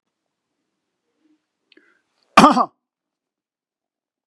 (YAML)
cough_length: 4.3 s
cough_amplitude: 32768
cough_signal_mean_std_ratio: 0.18
survey_phase: beta (2021-08-13 to 2022-03-07)
age: 65+
gender: Male
wearing_mask: 'No'
symptom_none: true
smoker_status: Never smoked
respiratory_condition_asthma: false
respiratory_condition_other: false
recruitment_source: REACT
submission_delay: 3 days
covid_test_result: Negative
covid_test_method: RT-qPCR
influenza_a_test_result: Negative
influenza_b_test_result: Negative